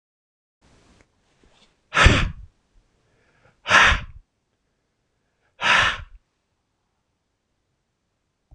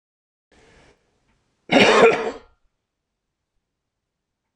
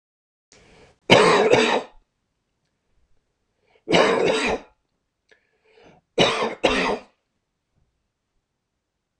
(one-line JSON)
{"exhalation_length": "8.5 s", "exhalation_amplitude": 26028, "exhalation_signal_mean_std_ratio": 0.27, "cough_length": "4.6 s", "cough_amplitude": 26028, "cough_signal_mean_std_ratio": 0.28, "three_cough_length": "9.2 s", "three_cough_amplitude": 26028, "three_cough_signal_mean_std_ratio": 0.37, "survey_phase": "beta (2021-08-13 to 2022-03-07)", "age": "65+", "gender": "Male", "wearing_mask": "No", "symptom_none": true, "symptom_onset": "7 days", "smoker_status": "Never smoked", "respiratory_condition_asthma": false, "respiratory_condition_other": false, "recruitment_source": "Test and Trace", "submission_delay": "3 days", "covid_test_result": "Negative", "covid_test_method": "RT-qPCR"}